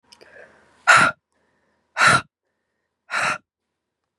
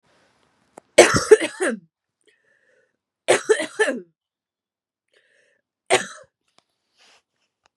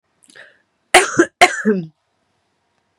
{"exhalation_length": "4.2 s", "exhalation_amplitude": 29367, "exhalation_signal_mean_std_ratio": 0.32, "three_cough_length": "7.8 s", "three_cough_amplitude": 32768, "three_cough_signal_mean_std_ratio": 0.25, "cough_length": "3.0 s", "cough_amplitude": 32768, "cough_signal_mean_std_ratio": 0.32, "survey_phase": "beta (2021-08-13 to 2022-03-07)", "age": "45-64", "gender": "Female", "wearing_mask": "No", "symptom_runny_or_blocked_nose": true, "symptom_sore_throat": true, "symptom_fatigue": true, "symptom_fever_high_temperature": true, "symptom_change_to_sense_of_smell_or_taste": true, "smoker_status": "Current smoker (1 to 10 cigarettes per day)", "respiratory_condition_asthma": true, "respiratory_condition_other": false, "recruitment_source": "Test and Trace", "submission_delay": "1 day", "covid_test_result": "Positive", "covid_test_method": "LFT"}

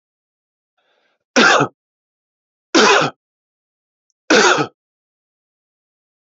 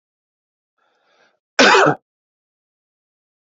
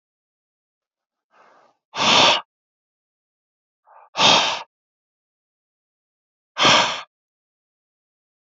{"three_cough_length": "6.3 s", "three_cough_amplitude": 30338, "three_cough_signal_mean_std_ratio": 0.32, "cough_length": "3.5 s", "cough_amplitude": 30630, "cough_signal_mean_std_ratio": 0.25, "exhalation_length": "8.4 s", "exhalation_amplitude": 27046, "exhalation_signal_mean_std_ratio": 0.3, "survey_phase": "beta (2021-08-13 to 2022-03-07)", "age": "45-64", "gender": "Male", "wearing_mask": "No", "symptom_runny_or_blocked_nose": true, "symptom_headache": true, "symptom_onset": "4 days", "smoker_status": "Never smoked", "respiratory_condition_asthma": false, "respiratory_condition_other": false, "recruitment_source": "REACT", "submission_delay": "1 day", "covid_test_result": "Negative", "covid_test_method": "RT-qPCR", "influenza_a_test_result": "Unknown/Void", "influenza_b_test_result": "Unknown/Void"}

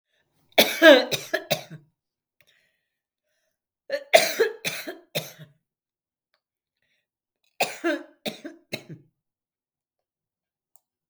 {"three_cough_length": "11.1 s", "three_cough_amplitude": 32766, "three_cough_signal_mean_std_ratio": 0.24, "survey_phase": "beta (2021-08-13 to 2022-03-07)", "age": "65+", "gender": "Female", "wearing_mask": "No", "symptom_none": true, "smoker_status": "Never smoked", "respiratory_condition_asthma": true, "respiratory_condition_other": false, "recruitment_source": "REACT", "submission_delay": "2 days", "covid_test_result": "Negative", "covid_test_method": "RT-qPCR", "influenza_a_test_result": "Negative", "influenza_b_test_result": "Negative"}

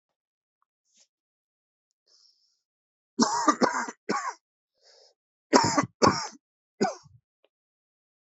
{"three_cough_length": "8.3 s", "three_cough_amplitude": 23929, "three_cough_signal_mean_std_ratio": 0.3, "survey_phase": "beta (2021-08-13 to 2022-03-07)", "age": "45-64", "gender": "Male", "wearing_mask": "No", "symptom_cough_any": true, "symptom_runny_or_blocked_nose": true, "symptom_headache": true, "symptom_loss_of_taste": true, "smoker_status": "Ex-smoker", "respiratory_condition_asthma": false, "respiratory_condition_other": false, "recruitment_source": "Test and Trace", "submission_delay": "2 days", "covid_test_result": "Positive", "covid_test_method": "LFT"}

